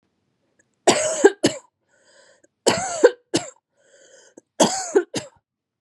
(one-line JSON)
{"three_cough_length": "5.8 s", "three_cough_amplitude": 32391, "three_cough_signal_mean_std_ratio": 0.33, "survey_phase": "beta (2021-08-13 to 2022-03-07)", "age": "18-44", "gender": "Female", "wearing_mask": "No", "symptom_runny_or_blocked_nose": true, "symptom_sore_throat": true, "symptom_fatigue": true, "symptom_headache": true, "symptom_other": true, "symptom_onset": "7 days", "smoker_status": "Never smoked", "respiratory_condition_asthma": false, "respiratory_condition_other": false, "recruitment_source": "Test and Trace", "submission_delay": "1 day", "covid_test_result": "Positive", "covid_test_method": "RT-qPCR", "covid_ct_value": 13.8, "covid_ct_gene": "ORF1ab gene", "covid_ct_mean": 14.1, "covid_viral_load": "25000000 copies/ml", "covid_viral_load_category": "High viral load (>1M copies/ml)"}